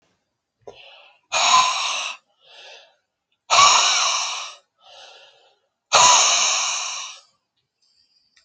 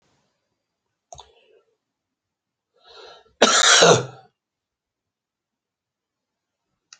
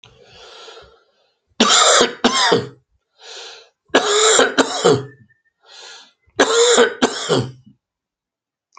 {
  "exhalation_length": "8.4 s",
  "exhalation_amplitude": 30506,
  "exhalation_signal_mean_std_ratio": 0.45,
  "cough_length": "7.0 s",
  "cough_amplitude": 28555,
  "cough_signal_mean_std_ratio": 0.24,
  "three_cough_length": "8.8 s",
  "three_cough_amplitude": 32767,
  "three_cough_signal_mean_std_ratio": 0.48,
  "survey_phase": "beta (2021-08-13 to 2022-03-07)",
  "age": "65+",
  "gender": "Male",
  "wearing_mask": "No",
  "symptom_cough_any": true,
  "symptom_runny_or_blocked_nose": true,
  "symptom_sore_throat": true,
  "symptom_fatigue": true,
  "symptom_headache": true,
  "symptom_onset": "4 days",
  "smoker_status": "Ex-smoker",
  "respiratory_condition_asthma": false,
  "respiratory_condition_other": false,
  "recruitment_source": "Test and Trace",
  "submission_delay": "2 days",
  "covid_test_result": "Positive",
  "covid_test_method": "RT-qPCR",
  "covid_ct_value": 20.9,
  "covid_ct_gene": "ORF1ab gene",
  "covid_ct_mean": 21.5,
  "covid_viral_load": "88000 copies/ml",
  "covid_viral_load_category": "Low viral load (10K-1M copies/ml)"
}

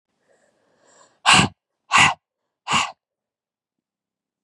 {
  "exhalation_length": "4.4 s",
  "exhalation_amplitude": 31199,
  "exhalation_signal_mean_std_ratio": 0.29,
  "survey_phase": "beta (2021-08-13 to 2022-03-07)",
  "age": "18-44",
  "gender": "Female",
  "wearing_mask": "No",
  "symptom_new_continuous_cough": true,
  "symptom_runny_or_blocked_nose": true,
  "symptom_shortness_of_breath": true,
  "symptom_sore_throat": true,
  "symptom_diarrhoea": true,
  "symptom_fatigue": true,
  "symptom_fever_high_temperature": true,
  "symptom_headache": true,
  "symptom_change_to_sense_of_smell_or_taste": true,
  "symptom_loss_of_taste": true,
  "symptom_onset": "3 days",
  "smoker_status": "Current smoker (e-cigarettes or vapes only)",
  "respiratory_condition_asthma": false,
  "respiratory_condition_other": false,
  "recruitment_source": "Test and Trace",
  "submission_delay": "1 day",
  "covid_test_result": "Positive",
  "covid_test_method": "RT-qPCR",
  "covid_ct_value": 20.7,
  "covid_ct_gene": "ORF1ab gene",
  "covid_ct_mean": 21.3,
  "covid_viral_load": "99000 copies/ml",
  "covid_viral_load_category": "Low viral load (10K-1M copies/ml)"
}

